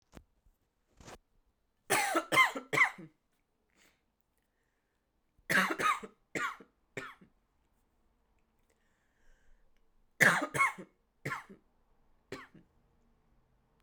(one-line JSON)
{"three_cough_length": "13.8 s", "three_cough_amplitude": 11219, "three_cough_signal_mean_std_ratio": 0.29, "survey_phase": "alpha (2021-03-01 to 2021-08-12)", "age": "18-44", "gender": "Female", "wearing_mask": "No", "symptom_cough_any": true, "symptom_headache": true, "smoker_status": "Never smoked", "respiratory_condition_asthma": false, "respiratory_condition_other": false, "recruitment_source": "Test and Trace", "submission_delay": "2 days", "covid_test_result": "Positive", "covid_test_method": "RT-qPCR", "covid_ct_value": 18.5, "covid_ct_gene": "ORF1ab gene", "covid_ct_mean": 19.7, "covid_viral_load": "340000 copies/ml", "covid_viral_load_category": "Low viral load (10K-1M copies/ml)"}